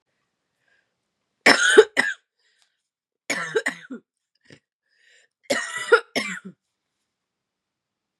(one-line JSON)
{"three_cough_length": "8.2 s", "three_cough_amplitude": 32655, "three_cough_signal_mean_std_ratio": 0.26, "survey_phase": "beta (2021-08-13 to 2022-03-07)", "age": "45-64", "gender": "Female", "wearing_mask": "No", "symptom_cough_any": true, "symptom_runny_or_blocked_nose": true, "symptom_sore_throat": true, "symptom_other": true, "symptom_onset": "5 days", "smoker_status": "Never smoked", "respiratory_condition_asthma": false, "respiratory_condition_other": false, "recruitment_source": "Test and Trace", "submission_delay": "2 days", "covid_test_result": "Positive", "covid_test_method": "ePCR"}